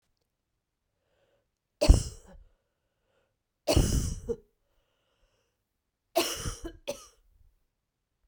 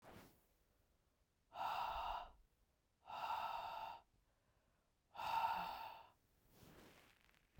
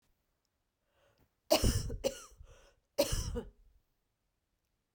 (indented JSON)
{
  "three_cough_length": "8.3 s",
  "three_cough_amplitude": 18620,
  "three_cough_signal_mean_std_ratio": 0.25,
  "exhalation_length": "7.6 s",
  "exhalation_amplitude": 1114,
  "exhalation_signal_mean_std_ratio": 0.51,
  "cough_length": "4.9 s",
  "cough_amplitude": 6648,
  "cough_signal_mean_std_ratio": 0.33,
  "survey_phase": "beta (2021-08-13 to 2022-03-07)",
  "age": "45-64",
  "gender": "Female",
  "wearing_mask": "No",
  "symptom_cough_any": true,
  "symptom_runny_or_blocked_nose": true,
  "symptom_fatigue": true,
  "symptom_other": true,
  "symptom_onset": "3 days",
  "smoker_status": "Never smoked",
  "respiratory_condition_asthma": false,
  "respiratory_condition_other": false,
  "recruitment_source": "Test and Trace",
  "submission_delay": "2 days",
  "covid_test_result": "Positive",
  "covid_test_method": "RT-qPCR",
  "covid_ct_value": 16.2,
  "covid_ct_gene": "ORF1ab gene"
}